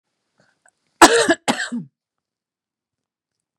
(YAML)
cough_length: 3.6 s
cough_amplitude: 32768
cough_signal_mean_std_ratio: 0.26
survey_phase: beta (2021-08-13 to 2022-03-07)
age: 45-64
gender: Female
wearing_mask: 'No'
symptom_none: true
smoker_status: Never smoked
respiratory_condition_asthma: false
respiratory_condition_other: false
recruitment_source: Test and Trace
submission_delay: 1 day
covid_test_result: Negative
covid_test_method: RT-qPCR